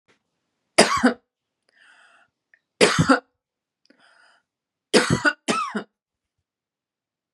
{"three_cough_length": "7.3 s", "three_cough_amplitude": 32767, "three_cough_signal_mean_std_ratio": 0.3, "survey_phase": "beta (2021-08-13 to 2022-03-07)", "age": "45-64", "gender": "Female", "wearing_mask": "No", "symptom_fatigue": true, "symptom_headache": true, "symptom_onset": "8 days", "smoker_status": "Ex-smoker", "respiratory_condition_asthma": false, "respiratory_condition_other": false, "recruitment_source": "REACT", "submission_delay": "0 days", "covid_test_result": "Negative", "covid_test_method": "RT-qPCR", "influenza_a_test_result": "Negative", "influenza_b_test_result": "Negative"}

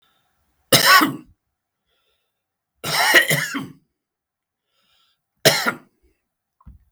{"three_cough_length": "6.9 s", "three_cough_amplitude": 32768, "three_cough_signal_mean_std_ratio": 0.33, "survey_phase": "beta (2021-08-13 to 2022-03-07)", "age": "65+", "gender": "Male", "wearing_mask": "No", "symptom_none": true, "smoker_status": "Ex-smoker", "respiratory_condition_asthma": false, "respiratory_condition_other": false, "recruitment_source": "REACT", "submission_delay": "2 days", "covid_test_result": "Negative", "covid_test_method": "RT-qPCR", "influenza_a_test_result": "Unknown/Void", "influenza_b_test_result": "Unknown/Void"}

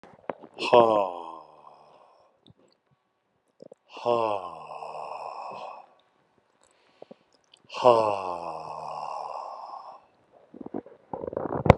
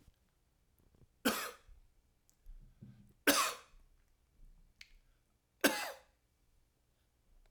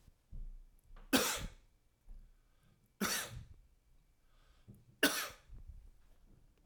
{"exhalation_length": "11.8 s", "exhalation_amplitude": 32768, "exhalation_signal_mean_std_ratio": 0.33, "cough_length": "7.5 s", "cough_amplitude": 6401, "cough_signal_mean_std_ratio": 0.26, "three_cough_length": "6.7 s", "three_cough_amplitude": 6232, "three_cough_signal_mean_std_ratio": 0.36, "survey_phase": "alpha (2021-03-01 to 2021-08-12)", "age": "45-64", "gender": "Male", "wearing_mask": "No", "symptom_none": true, "symptom_fatigue": true, "smoker_status": "Never smoked", "respiratory_condition_asthma": false, "respiratory_condition_other": false, "recruitment_source": "REACT", "submission_delay": "1 day", "covid_test_result": "Negative", "covid_test_method": "RT-qPCR"}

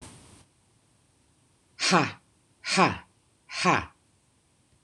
{"exhalation_length": "4.8 s", "exhalation_amplitude": 19058, "exhalation_signal_mean_std_ratio": 0.32, "survey_phase": "beta (2021-08-13 to 2022-03-07)", "age": "45-64", "gender": "Female", "wearing_mask": "No", "symptom_none": true, "smoker_status": "Current smoker (1 to 10 cigarettes per day)", "respiratory_condition_asthma": false, "respiratory_condition_other": false, "recruitment_source": "REACT", "submission_delay": "0 days", "covid_test_result": "Negative", "covid_test_method": "RT-qPCR"}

